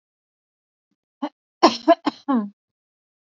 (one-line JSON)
{"cough_length": "3.2 s", "cough_amplitude": 29768, "cough_signal_mean_std_ratio": 0.26, "survey_phase": "beta (2021-08-13 to 2022-03-07)", "age": "18-44", "gender": "Female", "wearing_mask": "No", "symptom_cough_any": true, "symptom_headache": true, "symptom_other": true, "symptom_onset": "3 days", "smoker_status": "Never smoked", "respiratory_condition_asthma": false, "respiratory_condition_other": false, "recruitment_source": "Test and Trace", "submission_delay": "2 days", "covid_test_result": "Positive", "covid_test_method": "RT-qPCR", "covid_ct_value": 25.9, "covid_ct_gene": "N gene"}